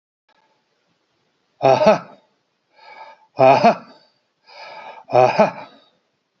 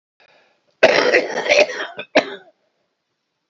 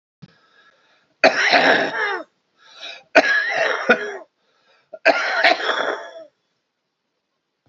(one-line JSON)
{"exhalation_length": "6.4 s", "exhalation_amplitude": 32767, "exhalation_signal_mean_std_ratio": 0.33, "cough_length": "3.5 s", "cough_amplitude": 29139, "cough_signal_mean_std_ratio": 0.41, "three_cough_length": "7.7 s", "three_cough_amplitude": 32768, "three_cough_signal_mean_std_ratio": 0.46, "survey_phase": "beta (2021-08-13 to 2022-03-07)", "age": "45-64", "gender": "Male", "wearing_mask": "No", "symptom_runny_or_blocked_nose": true, "symptom_shortness_of_breath": true, "symptom_change_to_sense_of_smell_or_taste": true, "symptom_onset": "12 days", "smoker_status": "Ex-smoker", "respiratory_condition_asthma": false, "respiratory_condition_other": true, "recruitment_source": "REACT", "submission_delay": "1 day", "covid_test_result": "Negative", "covid_test_method": "RT-qPCR", "covid_ct_value": 38.4, "covid_ct_gene": "E gene", "influenza_a_test_result": "Negative", "influenza_b_test_result": "Negative"}